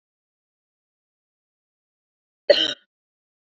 {"cough_length": "3.6 s", "cough_amplitude": 26334, "cough_signal_mean_std_ratio": 0.16, "survey_phase": "beta (2021-08-13 to 2022-03-07)", "age": "18-44", "gender": "Female", "wearing_mask": "No", "symptom_cough_any": true, "smoker_status": "Current smoker (e-cigarettes or vapes only)", "respiratory_condition_asthma": false, "respiratory_condition_other": false, "recruitment_source": "REACT", "submission_delay": "0 days", "covid_test_result": "Negative", "covid_test_method": "RT-qPCR"}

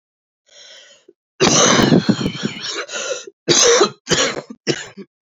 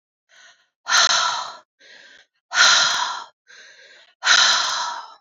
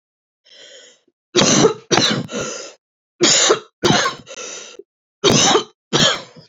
{"cough_length": "5.4 s", "cough_amplitude": 32767, "cough_signal_mean_std_ratio": 0.52, "exhalation_length": "5.2 s", "exhalation_amplitude": 28985, "exhalation_signal_mean_std_ratio": 0.5, "three_cough_length": "6.5 s", "three_cough_amplitude": 32767, "three_cough_signal_mean_std_ratio": 0.51, "survey_phase": "beta (2021-08-13 to 2022-03-07)", "age": "18-44", "gender": "Female", "wearing_mask": "No", "symptom_cough_any": true, "symptom_new_continuous_cough": true, "symptom_runny_or_blocked_nose": true, "symptom_shortness_of_breath": true, "symptom_sore_throat": true, "symptom_fatigue": true, "symptom_fever_high_temperature": true, "symptom_headache": true, "symptom_onset": "5 days", "smoker_status": "Ex-smoker", "respiratory_condition_asthma": false, "respiratory_condition_other": false, "recruitment_source": "REACT", "submission_delay": "1 day", "covid_test_result": "Negative", "covid_test_method": "RT-qPCR", "influenza_a_test_result": "Unknown/Void", "influenza_b_test_result": "Unknown/Void"}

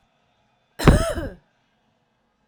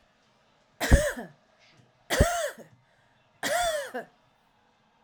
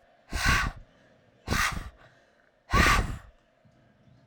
{"cough_length": "2.5 s", "cough_amplitude": 32768, "cough_signal_mean_std_ratio": 0.28, "three_cough_length": "5.0 s", "three_cough_amplitude": 17905, "three_cough_signal_mean_std_ratio": 0.36, "exhalation_length": "4.3 s", "exhalation_amplitude": 13051, "exhalation_signal_mean_std_ratio": 0.43, "survey_phase": "alpha (2021-03-01 to 2021-08-12)", "age": "45-64", "gender": "Female", "wearing_mask": "No", "symptom_none": true, "smoker_status": "Ex-smoker", "respiratory_condition_asthma": false, "respiratory_condition_other": false, "recruitment_source": "REACT", "submission_delay": "0 days", "covid_test_result": "Negative", "covid_test_method": "RT-qPCR"}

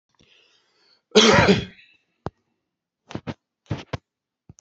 {"cough_length": "4.6 s", "cough_amplitude": 29552, "cough_signal_mean_std_ratio": 0.28, "survey_phase": "beta (2021-08-13 to 2022-03-07)", "age": "45-64", "gender": "Male", "wearing_mask": "No", "symptom_none": true, "smoker_status": "Never smoked", "respiratory_condition_asthma": false, "respiratory_condition_other": false, "recruitment_source": "REACT", "submission_delay": "1 day", "covid_test_result": "Negative", "covid_test_method": "RT-qPCR", "influenza_a_test_result": "Negative", "influenza_b_test_result": "Negative"}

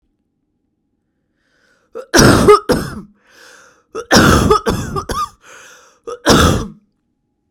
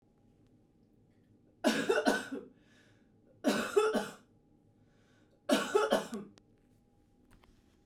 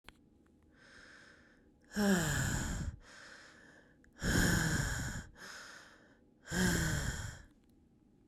{"cough_length": "7.5 s", "cough_amplitude": 32768, "cough_signal_mean_std_ratio": 0.42, "three_cough_length": "7.9 s", "three_cough_amplitude": 6818, "three_cough_signal_mean_std_ratio": 0.39, "exhalation_length": "8.3 s", "exhalation_amplitude": 3971, "exhalation_signal_mean_std_ratio": 0.53, "survey_phase": "beta (2021-08-13 to 2022-03-07)", "age": "18-44", "gender": "Female", "wearing_mask": "No", "symptom_cough_any": true, "symptom_runny_or_blocked_nose": true, "symptom_sore_throat": true, "symptom_diarrhoea": true, "symptom_fatigue": true, "symptom_fever_high_temperature": true, "symptom_headache": true, "symptom_loss_of_taste": true, "smoker_status": "Never smoked", "respiratory_condition_asthma": false, "respiratory_condition_other": false, "recruitment_source": "Test and Trace", "submission_delay": "3 days", "covid_test_result": "Positive", "covid_test_method": "RT-qPCR", "covid_ct_value": 21.2, "covid_ct_gene": "ORF1ab gene", "covid_ct_mean": 22.0, "covid_viral_load": "61000 copies/ml", "covid_viral_load_category": "Low viral load (10K-1M copies/ml)"}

